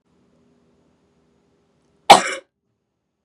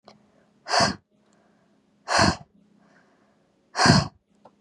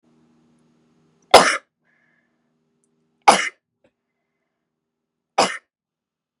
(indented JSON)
{
  "cough_length": "3.2 s",
  "cough_amplitude": 32768,
  "cough_signal_mean_std_ratio": 0.16,
  "exhalation_length": "4.6 s",
  "exhalation_amplitude": 26515,
  "exhalation_signal_mean_std_ratio": 0.33,
  "three_cough_length": "6.4 s",
  "three_cough_amplitude": 32768,
  "three_cough_signal_mean_std_ratio": 0.19,
  "survey_phase": "beta (2021-08-13 to 2022-03-07)",
  "age": "18-44",
  "gender": "Female",
  "wearing_mask": "No",
  "symptom_none": true,
  "smoker_status": "Never smoked",
  "respiratory_condition_asthma": false,
  "respiratory_condition_other": false,
  "recruitment_source": "REACT",
  "submission_delay": "3 days",
  "covid_test_result": "Negative",
  "covid_test_method": "RT-qPCR",
  "influenza_a_test_result": "Negative",
  "influenza_b_test_result": "Negative"
}